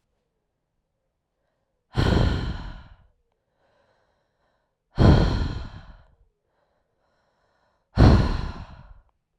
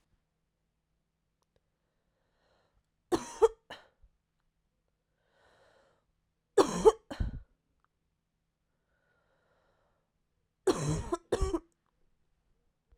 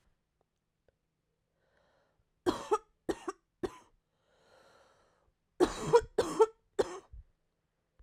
{"exhalation_length": "9.4 s", "exhalation_amplitude": 26210, "exhalation_signal_mean_std_ratio": 0.33, "three_cough_length": "13.0 s", "three_cough_amplitude": 11655, "three_cough_signal_mean_std_ratio": 0.21, "cough_length": "8.0 s", "cough_amplitude": 8392, "cough_signal_mean_std_ratio": 0.25, "survey_phase": "alpha (2021-03-01 to 2021-08-12)", "age": "18-44", "gender": "Female", "wearing_mask": "No", "symptom_cough_any": true, "symptom_new_continuous_cough": true, "symptom_shortness_of_breath": true, "symptom_abdominal_pain": true, "symptom_fatigue": true, "symptom_fever_high_temperature": true, "symptom_headache": true, "symptom_onset": "4 days", "smoker_status": "Never smoked", "respiratory_condition_asthma": true, "respiratory_condition_other": false, "recruitment_source": "Test and Trace", "submission_delay": "2 days", "covid_test_result": "Positive", "covid_test_method": "RT-qPCR", "covid_ct_value": 14.5, "covid_ct_gene": "ORF1ab gene", "covid_ct_mean": 14.9, "covid_viral_load": "13000000 copies/ml", "covid_viral_load_category": "High viral load (>1M copies/ml)"}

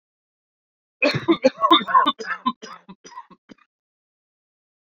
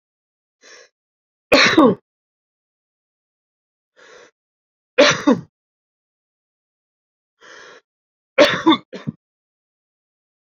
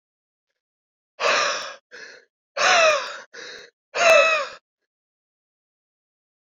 {"cough_length": "4.9 s", "cough_amplitude": 27140, "cough_signal_mean_std_ratio": 0.33, "three_cough_length": "10.6 s", "three_cough_amplitude": 30540, "three_cough_signal_mean_std_ratio": 0.25, "exhalation_length": "6.5 s", "exhalation_amplitude": 21199, "exhalation_signal_mean_std_ratio": 0.39, "survey_phase": "alpha (2021-03-01 to 2021-08-12)", "age": "18-44", "gender": "Male", "wearing_mask": "No", "symptom_cough_any": true, "symptom_fatigue": true, "symptom_change_to_sense_of_smell_or_taste": true, "symptom_loss_of_taste": true, "smoker_status": "Ex-smoker", "respiratory_condition_asthma": false, "respiratory_condition_other": false, "recruitment_source": "Test and Trace", "submission_delay": "2 days", "covid_test_result": "Positive", "covid_test_method": "LFT"}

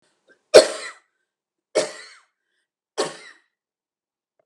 {"three_cough_length": "4.5 s", "three_cough_amplitude": 32768, "three_cough_signal_mean_std_ratio": 0.19, "survey_phase": "beta (2021-08-13 to 2022-03-07)", "age": "45-64", "gender": "Female", "wearing_mask": "No", "symptom_cough_any": true, "symptom_shortness_of_breath": true, "smoker_status": "Never smoked", "respiratory_condition_asthma": false, "respiratory_condition_other": true, "recruitment_source": "REACT", "submission_delay": "1 day", "covid_test_result": "Negative", "covid_test_method": "RT-qPCR"}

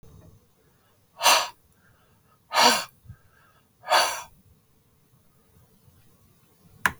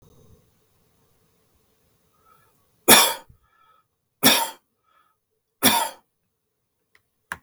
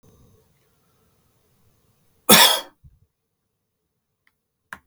{"exhalation_length": "7.0 s", "exhalation_amplitude": 28159, "exhalation_signal_mean_std_ratio": 0.29, "three_cough_length": "7.4 s", "three_cough_amplitude": 32768, "three_cough_signal_mean_std_ratio": 0.24, "cough_length": "4.9 s", "cough_amplitude": 32768, "cough_signal_mean_std_ratio": 0.2, "survey_phase": "beta (2021-08-13 to 2022-03-07)", "age": "45-64", "gender": "Male", "wearing_mask": "No", "symptom_none": true, "symptom_onset": "2 days", "smoker_status": "Never smoked", "respiratory_condition_asthma": false, "respiratory_condition_other": false, "recruitment_source": "REACT", "submission_delay": "2 days", "covid_test_result": "Negative", "covid_test_method": "RT-qPCR", "influenza_a_test_result": "Negative", "influenza_b_test_result": "Negative"}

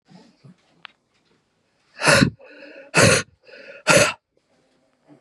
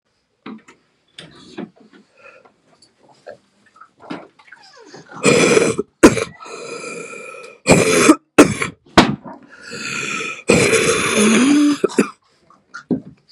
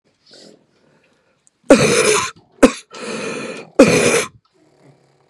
{"exhalation_length": "5.2 s", "exhalation_amplitude": 29798, "exhalation_signal_mean_std_ratio": 0.33, "three_cough_length": "13.3 s", "three_cough_amplitude": 32768, "three_cough_signal_mean_std_ratio": 0.43, "cough_length": "5.3 s", "cough_amplitude": 32768, "cough_signal_mean_std_ratio": 0.39, "survey_phase": "beta (2021-08-13 to 2022-03-07)", "age": "18-44", "gender": "Female", "wearing_mask": "No", "symptom_cough_any": true, "symptom_new_continuous_cough": true, "symptom_runny_or_blocked_nose": true, "symptom_shortness_of_breath": true, "symptom_sore_throat": true, "symptom_abdominal_pain": true, "symptom_diarrhoea": true, "symptom_fatigue": true, "symptom_fever_high_temperature": true, "symptom_headache": true, "symptom_onset": "2 days", "smoker_status": "Ex-smoker", "respiratory_condition_asthma": false, "respiratory_condition_other": false, "recruitment_source": "Test and Trace", "submission_delay": "2 days", "covid_test_result": "Positive", "covid_test_method": "RT-qPCR", "covid_ct_value": 18.0, "covid_ct_gene": "ORF1ab gene", "covid_ct_mean": 18.1, "covid_viral_load": "1100000 copies/ml", "covid_viral_load_category": "High viral load (>1M copies/ml)"}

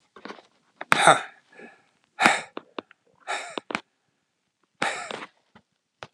{"exhalation_length": "6.1 s", "exhalation_amplitude": 32768, "exhalation_signal_mean_std_ratio": 0.27, "survey_phase": "alpha (2021-03-01 to 2021-08-12)", "age": "45-64", "gender": "Male", "wearing_mask": "No", "symptom_none": true, "smoker_status": "Ex-smoker", "respiratory_condition_asthma": false, "respiratory_condition_other": false, "recruitment_source": "REACT", "submission_delay": "1 day", "covid_test_result": "Negative", "covid_test_method": "RT-qPCR"}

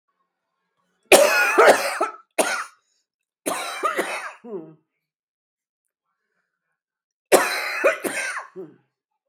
{"three_cough_length": "9.3 s", "three_cough_amplitude": 32768, "three_cough_signal_mean_std_ratio": 0.38, "survey_phase": "beta (2021-08-13 to 2022-03-07)", "age": "65+", "gender": "Female", "wearing_mask": "No", "symptom_cough_any": true, "symptom_runny_or_blocked_nose": true, "symptom_shortness_of_breath": true, "symptom_onset": "13 days", "smoker_status": "Ex-smoker", "respiratory_condition_asthma": true, "respiratory_condition_other": false, "recruitment_source": "REACT", "submission_delay": "2 days", "covid_test_result": "Negative", "covid_test_method": "RT-qPCR", "influenza_a_test_result": "Negative", "influenza_b_test_result": "Negative"}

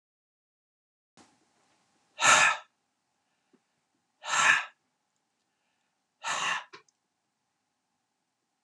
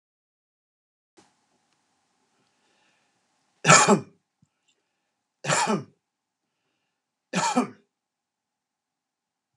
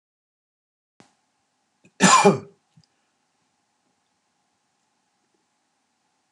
{"exhalation_length": "8.6 s", "exhalation_amplitude": 13305, "exhalation_signal_mean_std_ratio": 0.26, "three_cough_length": "9.6 s", "three_cough_amplitude": 29712, "three_cough_signal_mean_std_ratio": 0.23, "cough_length": "6.3 s", "cough_amplitude": 29237, "cough_signal_mean_std_ratio": 0.19, "survey_phase": "alpha (2021-03-01 to 2021-08-12)", "age": "65+", "gender": "Male", "wearing_mask": "No", "symptom_none": true, "smoker_status": "Never smoked", "respiratory_condition_asthma": false, "respiratory_condition_other": false, "recruitment_source": "REACT", "submission_delay": "1 day", "covid_test_result": "Negative", "covid_test_method": "RT-qPCR"}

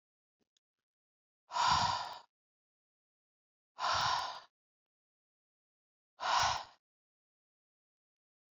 {"exhalation_length": "8.5 s", "exhalation_amplitude": 4443, "exhalation_signal_mean_std_ratio": 0.34, "survey_phase": "beta (2021-08-13 to 2022-03-07)", "age": "18-44", "gender": "Female", "wearing_mask": "No", "symptom_cough_any": true, "symptom_runny_or_blocked_nose": true, "symptom_fatigue": true, "symptom_headache": true, "symptom_onset": "3 days", "smoker_status": "Never smoked", "respiratory_condition_asthma": false, "respiratory_condition_other": false, "recruitment_source": "REACT", "submission_delay": "1 day", "covid_test_result": "Negative", "covid_test_method": "RT-qPCR"}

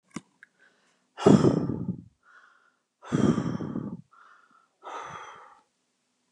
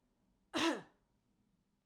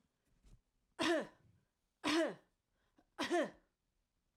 {"exhalation_length": "6.3 s", "exhalation_amplitude": 21551, "exhalation_signal_mean_std_ratio": 0.33, "cough_length": "1.9 s", "cough_amplitude": 2783, "cough_signal_mean_std_ratio": 0.31, "three_cough_length": "4.4 s", "three_cough_amplitude": 2092, "three_cough_signal_mean_std_ratio": 0.37, "survey_phase": "alpha (2021-03-01 to 2021-08-12)", "age": "45-64", "gender": "Female", "wearing_mask": "No", "symptom_none": true, "smoker_status": "Never smoked", "respiratory_condition_asthma": false, "respiratory_condition_other": false, "recruitment_source": "REACT", "submission_delay": "1 day", "covid_test_result": "Negative", "covid_test_method": "RT-qPCR"}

